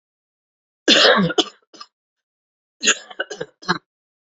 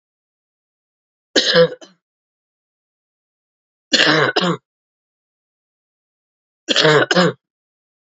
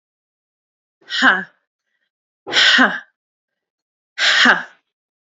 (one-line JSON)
{"cough_length": "4.4 s", "cough_amplitude": 30191, "cough_signal_mean_std_ratio": 0.33, "three_cough_length": "8.1 s", "three_cough_amplitude": 31470, "three_cough_signal_mean_std_ratio": 0.34, "exhalation_length": "5.2 s", "exhalation_amplitude": 30127, "exhalation_signal_mean_std_ratio": 0.38, "survey_phase": "alpha (2021-03-01 to 2021-08-12)", "age": "18-44", "gender": "Female", "wearing_mask": "No", "symptom_cough_any": true, "symptom_fatigue": true, "symptom_fever_high_temperature": true, "symptom_headache": true, "smoker_status": "Never smoked", "respiratory_condition_asthma": false, "respiratory_condition_other": false, "recruitment_source": "Test and Trace", "submission_delay": "2 days", "covid_test_result": "Positive", "covid_test_method": "RT-qPCR", "covid_ct_value": 26.3, "covid_ct_gene": "ORF1ab gene", "covid_ct_mean": 27.0, "covid_viral_load": "1400 copies/ml", "covid_viral_load_category": "Minimal viral load (< 10K copies/ml)"}